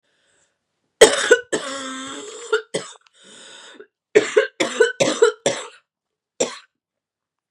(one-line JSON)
{"cough_length": "7.5 s", "cough_amplitude": 32768, "cough_signal_mean_std_ratio": 0.35, "survey_phase": "beta (2021-08-13 to 2022-03-07)", "age": "18-44", "gender": "Female", "wearing_mask": "No", "symptom_cough_any": true, "symptom_runny_or_blocked_nose": true, "symptom_sore_throat": true, "symptom_headache": true, "symptom_onset": "2 days", "smoker_status": "Never smoked", "respiratory_condition_asthma": false, "respiratory_condition_other": false, "recruitment_source": "Test and Trace", "submission_delay": "1 day", "covid_test_result": "Positive", "covid_test_method": "ePCR"}